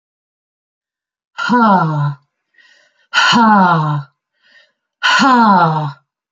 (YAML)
exhalation_length: 6.3 s
exhalation_amplitude: 30961
exhalation_signal_mean_std_ratio: 0.56
survey_phase: beta (2021-08-13 to 2022-03-07)
age: 45-64
gender: Female
wearing_mask: 'No'
symptom_none: true
smoker_status: Never smoked
respiratory_condition_asthma: false
respiratory_condition_other: false
recruitment_source: REACT
submission_delay: 1 day
covid_test_result: Negative
covid_test_method: RT-qPCR
influenza_a_test_result: Negative
influenza_b_test_result: Negative